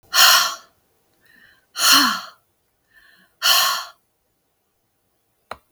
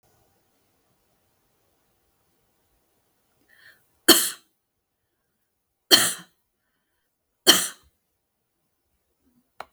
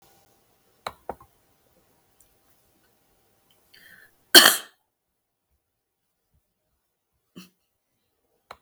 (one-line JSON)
{"exhalation_length": "5.7 s", "exhalation_amplitude": 32768, "exhalation_signal_mean_std_ratio": 0.36, "three_cough_length": "9.7 s", "three_cough_amplitude": 32766, "three_cough_signal_mean_std_ratio": 0.18, "cough_length": "8.6 s", "cough_amplitude": 32768, "cough_signal_mean_std_ratio": 0.13, "survey_phase": "beta (2021-08-13 to 2022-03-07)", "age": "65+", "gender": "Female", "wearing_mask": "No", "symptom_none": true, "smoker_status": "Never smoked", "respiratory_condition_asthma": false, "respiratory_condition_other": false, "recruitment_source": "REACT", "submission_delay": "2 days", "covid_test_result": "Negative", "covid_test_method": "RT-qPCR"}